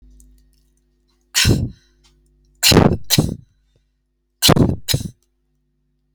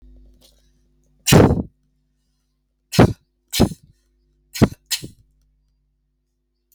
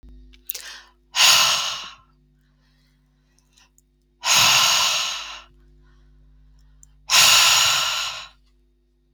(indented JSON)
{
  "cough_length": "6.1 s",
  "cough_amplitude": 32768,
  "cough_signal_mean_std_ratio": 0.36,
  "three_cough_length": "6.7 s",
  "three_cough_amplitude": 30959,
  "three_cough_signal_mean_std_ratio": 0.25,
  "exhalation_length": "9.1 s",
  "exhalation_amplitude": 32767,
  "exhalation_signal_mean_std_ratio": 0.45,
  "survey_phase": "alpha (2021-03-01 to 2021-08-12)",
  "age": "45-64",
  "gender": "Female",
  "wearing_mask": "No",
  "symptom_none": true,
  "smoker_status": "Never smoked",
  "respiratory_condition_asthma": false,
  "respiratory_condition_other": false,
  "recruitment_source": "REACT",
  "submission_delay": "1 day",
  "covid_test_result": "Negative",
  "covid_test_method": "RT-qPCR"
}